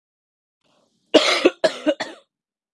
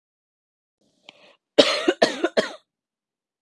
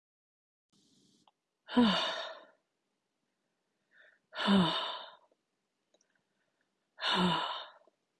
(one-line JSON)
{"three_cough_length": "2.7 s", "three_cough_amplitude": 31642, "three_cough_signal_mean_std_ratio": 0.33, "cough_length": "3.4 s", "cough_amplitude": 32768, "cough_signal_mean_std_ratio": 0.28, "exhalation_length": "8.2 s", "exhalation_amplitude": 6274, "exhalation_signal_mean_std_ratio": 0.36, "survey_phase": "beta (2021-08-13 to 2022-03-07)", "age": "18-44", "gender": "Female", "wearing_mask": "No", "symptom_none": true, "smoker_status": "Never smoked", "respiratory_condition_asthma": false, "respiratory_condition_other": false, "recruitment_source": "REACT", "submission_delay": "1 day", "covid_test_result": "Negative", "covid_test_method": "RT-qPCR", "influenza_a_test_result": "Negative", "influenza_b_test_result": "Negative"}